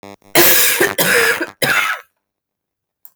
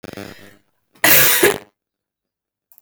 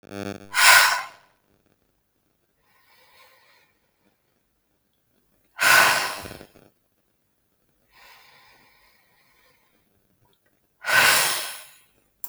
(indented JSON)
{
  "three_cough_length": "3.2 s",
  "three_cough_amplitude": 32768,
  "three_cough_signal_mean_std_ratio": 0.57,
  "cough_length": "2.8 s",
  "cough_amplitude": 32768,
  "cough_signal_mean_std_ratio": 0.36,
  "exhalation_length": "12.3 s",
  "exhalation_amplitude": 32033,
  "exhalation_signal_mean_std_ratio": 0.29,
  "survey_phase": "beta (2021-08-13 to 2022-03-07)",
  "age": "18-44",
  "gender": "Female",
  "wearing_mask": "No",
  "symptom_cough_any": true,
  "symptom_runny_or_blocked_nose": true,
  "symptom_shortness_of_breath": true,
  "symptom_sore_throat": true,
  "symptom_diarrhoea": true,
  "symptom_fatigue": true,
  "symptom_headache": true,
  "symptom_onset": "3 days",
  "smoker_status": "Ex-smoker",
  "respiratory_condition_asthma": false,
  "respiratory_condition_other": false,
  "recruitment_source": "Test and Trace",
  "submission_delay": "1 day",
  "covid_test_result": "Positive",
  "covid_test_method": "RT-qPCR",
  "covid_ct_value": 25.3,
  "covid_ct_gene": "ORF1ab gene"
}